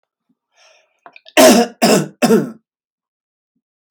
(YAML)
cough_length: 3.9 s
cough_amplitude: 32767
cough_signal_mean_std_ratio: 0.36
survey_phase: beta (2021-08-13 to 2022-03-07)
age: 45-64
gender: Male
wearing_mask: 'No'
symptom_none: true
smoker_status: Ex-smoker
respiratory_condition_asthma: false
respiratory_condition_other: false
recruitment_source: REACT
submission_delay: 1 day
covid_test_result: Negative
covid_test_method: RT-qPCR